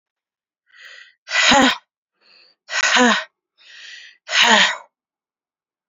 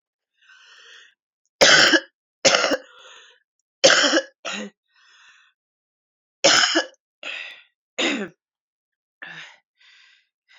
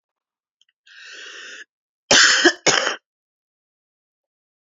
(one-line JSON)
{"exhalation_length": "5.9 s", "exhalation_amplitude": 31779, "exhalation_signal_mean_std_ratio": 0.4, "three_cough_length": "10.6 s", "three_cough_amplitude": 32767, "three_cough_signal_mean_std_ratio": 0.33, "cough_length": "4.7 s", "cough_amplitude": 30557, "cough_signal_mean_std_ratio": 0.31, "survey_phase": "beta (2021-08-13 to 2022-03-07)", "age": "18-44", "gender": "Female", "wearing_mask": "No", "symptom_cough_any": true, "symptom_runny_or_blocked_nose": true, "symptom_shortness_of_breath": true, "symptom_sore_throat": true, "symptom_fatigue": true, "symptom_change_to_sense_of_smell_or_taste": true, "symptom_onset": "4 days", "smoker_status": "Current smoker (e-cigarettes or vapes only)", "respiratory_condition_asthma": false, "respiratory_condition_other": false, "recruitment_source": "Test and Trace", "submission_delay": "1 day", "covid_test_result": "Positive", "covid_test_method": "RT-qPCR"}